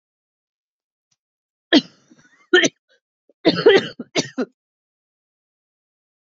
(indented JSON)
{
  "cough_length": "6.4 s",
  "cough_amplitude": 27930,
  "cough_signal_mean_std_ratio": 0.25,
  "survey_phase": "beta (2021-08-13 to 2022-03-07)",
  "age": "18-44",
  "gender": "Female",
  "wearing_mask": "No",
  "symptom_cough_any": true,
  "symptom_runny_or_blocked_nose": true,
  "symptom_shortness_of_breath": true,
  "symptom_sore_throat": true,
  "symptom_fatigue": true,
  "symptom_change_to_sense_of_smell_or_taste": true,
  "symptom_loss_of_taste": true,
  "smoker_status": "Ex-smoker",
  "respiratory_condition_asthma": false,
  "respiratory_condition_other": false,
  "recruitment_source": "Test and Trace",
  "submission_delay": "4 days",
  "covid_test_result": "Positive",
  "covid_test_method": "RT-qPCR",
  "covid_ct_value": 27.8,
  "covid_ct_gene": "ORF1ab gene",
  "covid_ct_mean": 28.5,
  "covid_viral_load": "450 copies/ml",
  "covid_viral_load_category": "Minimal viral load (< 10K copies/ml)"
}